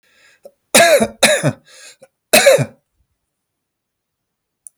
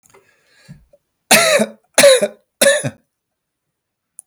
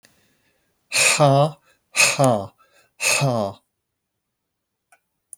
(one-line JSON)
{"cough_length": "4.8 s", "cough_amplitude": 32768, "cough_signal_mean_std_ratio": 0.36, "three_cough_length": "4.3 s", "three_cough_amplitude": 32768, "three_cough_signal_mean_std_ratio": 0.37, "exhalation_length": "5.4 s", "exhalation_amplitude": 26511, "exhalation_signal_mean_std_ratio": 0.43, "survey_phase": "beta (2021-08-13 to 2022-03-07)", "age": "45-64", "gender": "Male", "wearing_mask": "No", "symptom_none": true, "smoker_status": "Never smoked", "respiratory_condition_asthma": false, "respiratory_condition_other": false, "recruitment_source": "REACT", "submission_delay": "1 day", "covid_test_result": "Negative", "covid_test_method": "RT-qPCR", "influenza_a_test_result": "Negative", "influenza_b_test_result": "Negative"}